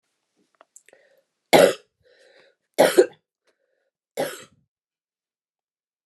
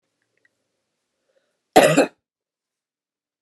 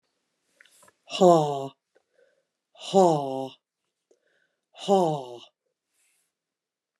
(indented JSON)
{
  "three_cough_length": "6.1 s",
  "three_cough_amplitude": 29204,
  "three_cough_signal_mean_std_ratio": 0.22,
  "cough_length": "3.4 s",
  "cough_amplitude": 29204,
  "cough_signal_mean_std_ratio": 0.22,
  "exhalation_length": "7.0 s",
  "exhalation_amplitude": 17956,
  "exhalation_signal_mean_std_ratio": 0.29,
  "survey_phase": "beta (2021-08-13 to 2022-03-07)",
  "age": "45-64",
  "gender": "Female",
  "wearing_mask": "No",
  "symptom_cough_any": true,
  "symptom_runny_or_blocked_nose": true,
  "symptom_fatigue": true,
  "smoker_status": "Ex-smoker",
  "respiratory_condition_asthma": false,
  "respiratory_condition_other": false,
  "recruitment_source": "Test and Trace",
  "submission_delay": "1 day",
  "covid_test_result": "Positive",
  "covid_test_method": "RT-qPCR",
  "covid_ct_value": 17.6,
  "covid_ct_gene": "ORF1ab gene",
  "covid_ct_mean": 17.9,
  "covid_viral_load": "1400000 copies/ml",
  "covid_viral_load_category": "High viral load (>1M copies/ml)"
}